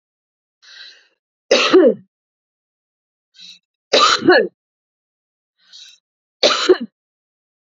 {"three_cough_length": "7.8 s", "three_cough_amplitude": 32768, "three_cough_signal_mean_std_ratio": 0.32, "survey_phase": "beta (2021-08-13 to 2022-03-07)", "age": "45-64", "gender": "Female", "wearing_mask": "No", "symptom_none": true, "smoker_status": "Ex-smoker", "respiratory_condition_asthma": false, "respiratory_condition_other": false, "recruitment_source": "REACT", "submission_delay": "2 days", "covid_test_result": "Negative", "covid_test_method": "RT-qPCR"}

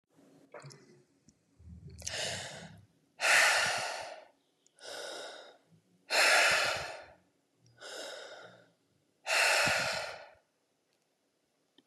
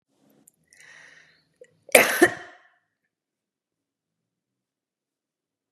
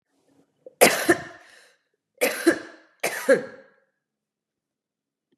{"exhalation_length": "11.9 s", "exhalation_amplitude": 7462, "exhalation_signal_mean_std_ratio": 0.43, "cough_length": "5.7 s", "cough_amplitude": 32768, "cough_signal_mean_std_ratio": 0.17, "three_cough_length": "5.4 s", "three_cough_amplitude": 28206, "three_cough_signal_mean_std_ratio": 0.3, "survey_phase": "beta (2021-08-13 to 2022-03-07)", "age": "45-64", "gender": "Female", "wearing_mask": "No", "symptom_sore_throat": true, "symptom_fatigue": true, "symptom_headache": true, "symptom_onset": "8 days", "smoker_status": "Ex-smoker", "respiratory_condition_asthma": true, "respiratory_condition_other": false, "recruitment_source": "REACT", "submission_delay": "3 days", "covid_test_result": "Negative", "covid_test_method": "RT-qPCR", "influenza_a_test_result": "Negative", "influenza_b_test_result": "Negative"}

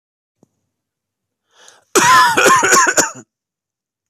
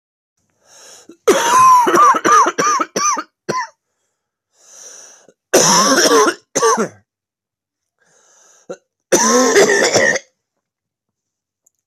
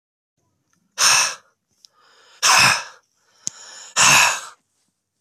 {"cough_length": "4.1 s", "cough_amplitude": 32768, "cough_signal_mean_std_ratio": 0.44, "three_cough_length": "11.9 s", "three_cough_amplitude": 32768, "three_cough_signal_mean_std_ratio": 0.51, "exhalation_length": "5.2 s", "exhalation_amplitude": 32767, "exhalation_signal_mean_std_ratio": 0.39, "survey_phase": "beta (2021-08-13 to 2022-03-07)", "age": "18-44", "gender": "Male", "wearing_mask": "No", "symptom_cough_any": true, "symptom_runny_or_blocked_nose": true, "symptom_fatigue": true, "symptom_fever_high_temperature": true, "symptom_headache": true, "smoker_status": "Never smoked", "respiratory_condition_asthma": true, "respiratory_condition_other": false, "recruitment_source": "Test and Trace", "submission_delay": "1 day", "covid_test_result": "Positive", "covid_test_method": "LFT"}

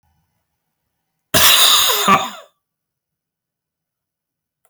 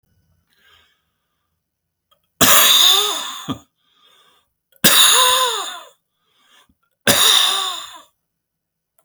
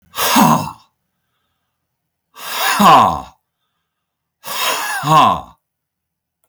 {"cough_length": "4.7 s", "cough_amplitude": 32768, "cough_signal_mean_std_ratio": 0.36, "three_cough_length": "9.0 s", "three_cough_amplitude": 32768, "three_cough_signal_mean_std_ratio": 0.42, "exhalation_length": "6.5 s", "exhalation_amplitude": 32768, "exhalation_signal_mean_std_ratio": 0.43, "survey_phase": "beta (2021-08-13 to 2022-03-07)", "age": "65+", "gender": "Male", "wearing_mask": "No", "symptom_none": true, "smoker_status": "Ex-smoker", "respiratory_condition_asthma": false, "respiratory_condition_other": false, "recruitment_source": "REACT", "submission_delay": "1 day", "covid_test_result": "Negative", "covid_test_method": "RT-qPCR"}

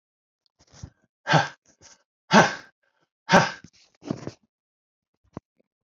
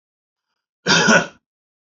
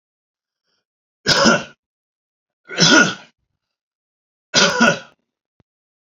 {"exhalation_length": "6.0 s", "exhalation_amplitude": 28270, "exhalation_signal_mean_std_ratio": 0.24, "cough_length": "1.9 s", "cough_amplitude": 30007, "cough_signal_mean_std_ratio": 0.36, "three_cough_length": "6.1 s", "three_cough_amplitude": 32767, "three_cough_signal_mean_std_ratio": 0.34, "survey_phase": "beta (2021-08-13 to 2022-03-07)", "age": "45-64", "gender": "Male", "wearing_mask": "No", "symptom_none": true, "smoker_status": "Ex-smoker", "respiratory_condition_asthma": false, "respiratory_condition_other": false, "recruitment_source": "REACT", "submission_delay": "2 days", "covid_test_result": "Negative", "covid_test_method": "RT-qPCR"}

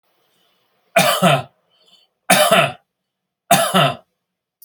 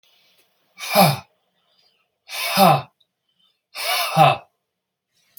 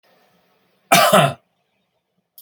{"three_cough_length": "4.6 s", "three_cough_amplitude": 32768, "three_cough_signal_mean_std_ratio": 0.42, "exhalation_length": "5.4 s", "exhalation_amplitude": 31704, "exhalation_signal_mean_std_ratio": 0.37, "cough_length": "2.4 s", "cough_amplitude": 32346, "cough_signal_mean_std_ratio": 0.33, "survey_phase": "beta (2021-08-13 to 2022-03-07)", "age": "45-64", "gender": "Male", "wearing_mask": "No", "symptom_none": true, "smoker_status": "Never smoked", "respiratory_condition_asthma": false, "respiratory_condition_other": false, "recruitment_source": "REACT", "submission_delay": "1 day", "covid_test_result": "Negative", "covid_test_method": "RT-qPCR"}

